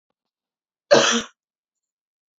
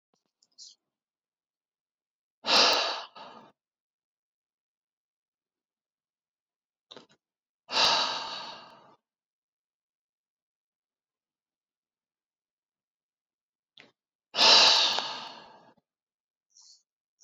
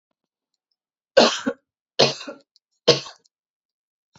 cough_length: 2.4 s
cough_amplitude: 27610
cough_signal_mean_std_ratio: 0.27
exhalation_length: 17.2 s
exhalation_amplitude: 15642
exhalation_signal_mean_std_ratio: 0.25
three_cough_length: 4.2 s
three_cough_amplitude: 32024
three_cough_signal_mean_std_ratio: 0.26
survey_phase: beta (2021-08-13 to 2022-03-07)
age: 45-64
gender: Female
wearing_mask: 'No'
symptom_none: true
smoker_status: Never smoked
respiratory_condition_asthma: false
respiratory_condition_other: false
recruitment_source: REACT
submission_delay: 2 days
covid_test_result: Negative
covid_test_method: RT-qPCR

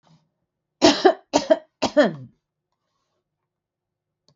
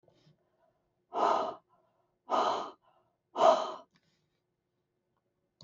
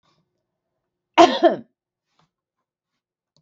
three_cough_length: 4.4 s
three_cough_amplitude: 31973
three_cough_signal_mean_std_ratio: 0.28
exhalation_length: 5.6 s
exhalation_amplitude: 8922
exhalation_signal_mean_std_ratio: 0.33
cough_length: 3.4 s
cough_amplitude: 32766
cough_signal_mean_std_ratio: 0.21
survey_phase: beta (2021-08-13 to 2022-03-07)
age: 45-64
gender: Female
wearing_mask: 'No'
symptom_none: true
smoker_status: Never smoked
respiratory_condition_asthma: false
respiratory_condition_other: false
recruitment_source: REACT
submission_delay: -1 day
covid_test_result: Negative
covid_test_method: RT-qPCR
influenza_a_test_result: Negative
influenza_b_test_result: Negative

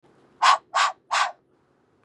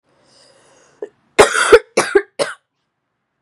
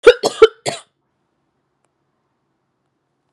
exhalation_length: 2.0 s
exhalation_amplitude: 23005
exhalation_signal_mean_std_ratio: 0.4
cough_length: 3.4 s
cough_amplitude: 32768
cough_signal_mean_std_ratio: 0.31
three_cough_length: 3.3 s
three_cough_amplitude: 32768
three_cough_signal_mean_std_ratio: 0.2
survey_phase: beta (2021-08-13 to 2022-03-07)
age: 18-44
gender: Female
wearing_mask: 'No'
symptom_cough_any: true
symptom_runny_or_blocked_nose: true
symptom_sore_throat: true
symptom_onset: 3 days
smoker_status: Never smoked
respiratory_condition_asthma: false
respiratory_condition_other: false
recruitment_source: Test and Trace
submission_delay: 2 days
covid_test_result: Positive
covid_test_method: RT-qPCR
covid_ct_value: 27.9
covid_ct_gene: ORF1ab gene
covid_ct_mean: 27.9
covid_viral_load: 690 copies/ml
covid_viral_load_category: Minimal viral load (< 10K copies/ml)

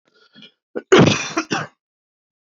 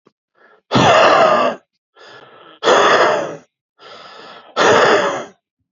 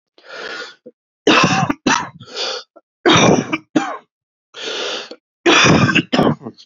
cough_length: 2.6 s
cough_amplitude: 28702
cough_signal_mean_std_ratio: 0.33
exhalation_length: 5.7 s
exhalation_amplitude: 29363
exhalation_signal_mean_std_ratio: 0.55
three_cough_length: 6.7 s
three_cough_amplitude: 30892
three_cough_signal_mean_std_ratio: 0.53
survey_phase: beta (2021-08-13 to 2022-03-07)
age: 18-44
gender: Male
wearing_mask: 'No'
symptom_cough_any: true
symptom_runny_or_blocked_nose: true
symptom_shortness_of_breath: true
symptom_sore_throat: true
symptom_fatigue: true
symptom_fever_high_temperature: true
symptom_headache: true
symptom_change_to_sense_of_smell_or_taste: true
symptom_loss_of_taste: true
symptom_onset: 5 days
smoker_status: Never smoked
respiratory_condition_asthma: true
respiratory_condition_other: false
recruitment_source: Test and Trace
submission_delay: 2 days
covid_test_result: Positive
covid_test_method: RT-qPCR
covid_ct_value: 38.0
covid_ct_gene: N gene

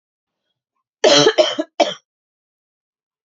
three_cough_length: 3.2 s
three_cough_amplitude: 32533
three_cough_signal_mean_std_ratio: 0.33
survey_phase: beta (2021-08-13 to 2022-03-07)
age: 18-44
gender: Female
wearing_mask: 'No'
symptom_cough_any: true
symptom_runny_or_blocked_nose: true
symptom_other: true
symptom_onset: 5 days
smoker_status: Never smoked
respiratory_condition_asthma: true
respiratory_condition_other: false
recruitment_source: Test and Trace
submission_delay: 2 days
covid_test_result: Negative
covid_test_method: RT-qPCR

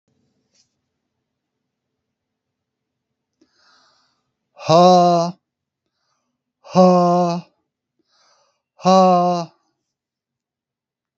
exhalation_length: 11.2 s
exhalation_amplitude: 32732
exhalation_signal_mean_std_ratio: 0.34
survey_phase: alpha (2021-03-01 to 2021-08-12)
age: 65+
gender: Male
wearing_mask: 'No'
symptom_none: true
smoker_status: Current smoker (11 or more cigarettes per day)
respiratory_condition_asthma: false
respiratory_condition_other: false
recruitment_source: REACT
submission_delay: 3 days
covid_test_method: RT-qPCR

